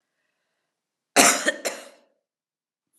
{
  "cough_length": "3.0 s",
  "cough_amplitude": 31096,
  "cough_signal_mean_std_ratio": 0.27,
  "survey_phase": "beta (2021-08-13 to 2022-03-07)",
  "age": "45-64",
  "gender": "Female",
  "wearing_mask": "No",
  "symptom_runny_or_blocked_nose": true,
  "symptom_sore_throat": true,
  "symptom_fatigue": true,
  "symptom_headache": true,
  "symptom_change_to_sense_of_smell_or_taste": true,
  "symptom_loss_of_taste": true,
  "symptom_onset": "5 days",
  "smoker_status": "Ex-smoker",
  "respiratory_condition_asthma": false,
  "respiratory_condition_other": false,
  "recruitment_source": "Test and Trace",
  "submission_delay": "2 days",
  "covid_test_result": "Positive",
  "covid_test_method": "RT-qPCR",
  "covid_ct_value": 14.0,
  "covid_ct_gene": "N gene"
}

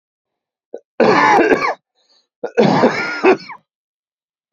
{
  "cough_length": "4.5 s",
  "cough_amplitude": 29580,
  "cough_signal_mean_std_ratio": 0.47,
  "survey_phase": "beta (2021-08-13 to 2022-03-07)",
  "age": "18-44",
  "gender": "Male",
  "wearing_mask": "No",
  "symptom_cough_any": true,
  "smoker_status": "Ex-smoker",
  "respiratory_condition_asthma": false,
  "respiratory_condition_other": false,
  "recruitment_source": "REACT",
  "submission_delay": "2 days",
  "covid_test_result": "Negative",
  "covid_test_method": "RT-qPCR",
  "influenza_a_test_result": "Unknown/Void",
  "influenza_b_test_result": "Unknown/Void"
}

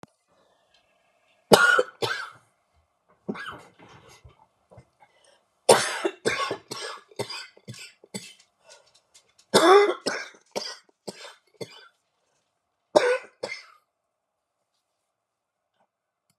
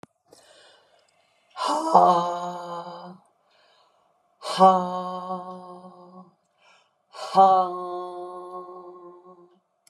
{
  "three_cough_length": "16.4 s",
  "three_cough_amplitude": 32768,
  "three_cough_signal_mean_std_ratio": 0.28,
  "exhalation_length": "9.9 s",
  "exhalation_amplitude": 24969,
  "exhalation_signal_mean_std_ratio": 0.39,
  "survey_phase": "beta (2021-08-13 to 2022-03-07)",
  "age": "65+",
  "gender": "Female",
  "wearing_mask": "No",
  "symptom_cough_any": true,
  "symptom_new_continuous_cough": true,
  "symptom_shortness_of_breath": true,
  "symptom_fatigue": true,
  "symptom_headache": true,
  "symptom_onset": "12 days",
  "smoker_status": "Never smoked",
  "respiratory_condition_asthma": true,
  "respiratory_condition_other": false,
  "recruitment_source": "REACT",
  "submission_delay": "0 days",
  "covid_test_result": "Negative",
  "covid_test_method": "RT-qPCR"
}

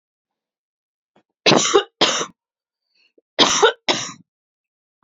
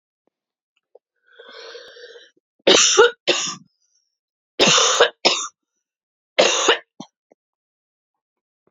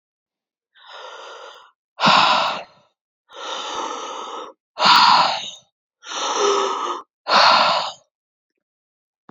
{
  "cough_length": "5.0 s",
  "cough_amplitude": 29563,
  "cough_signal_mean_std_ratio": 0.34,
  "three_cough_length": "8.7 s",
  "three_cough_amplitude": 29539,
  "three_cough_signal_mean_std_ratio": 0.35,
  "exhalation_length": "9.3 s",
  "exhalation_amplitude": 28324,
  "exhalation_signal_mean_std_ratio": 0.48,
  "survey_phase": "beta (2021-08-13 to 2022-03-07)",
  "age": "45-64",
  "gender": "Female",
  "wearing_mask": "No",
  "symptom_cough_any": true,
  "symptom_runny_or_blocked_nose": true,
  "symptom_fatigue": true,
  "symptom_headache": true,
  "symptom_change_to_sense_of_smell_or_taste": true,
  "symptom_other": true,
  "symptom_onset": "3 days",
  "smoker_status": "Ex-smoker",
  "respiratory_condition_asthma": false,
  "respiratory_condition_other": false,
  "recruitment_source": "Test and Trace",
  "submission_delay": "2 days",
  "covid_test_result": "Positive",
  "covid_test_method": "ePCR"
}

